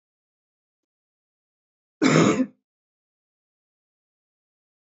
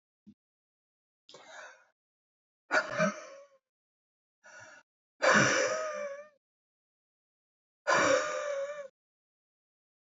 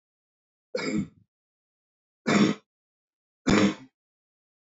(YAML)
cough_length: 4.9 s
cough_amplitude: 21785
cough_signal_mean_std_ratio: 0.23
exhalation_length: 10.1 s
exhalation_amplitude: 9144
exhalation_signal_mean_std_ratio: 0.36
three_cough_length: 4.6 s
three_cough_amplitude: 11936
three_cough_signal_mean_std_ratio: 0.33
survey_phase: beta (2021-08-13 to 2022-03-07)
age: 45-64
gender: Male
wearing_mask: 'No'
symptom_cough_any: true
symptom_sore_throat: true
symptom_abdominal_pain: true
symptom_fatigue: true
symptom_fever_high_temperature: true
symptom_headache: true
symptom_other: true
symptom_onset: 2 days
smoker_status: Never smoked
respiratory_condition_asthma: false
respiratory_condition_other: false
recruitment_source: Test and Trace
submission_delay: 1 day
covid_test_result: Positive
covid_test_method: RT-qPCR
covid_ct_value: 18.1
covid_ct_gene: ORF1ab gene
covid_ct_mean: 18.8
covid_viral_load: 690000 copies/ml
covid_viral_load_category: Low viral load (10K-1M copies/ml)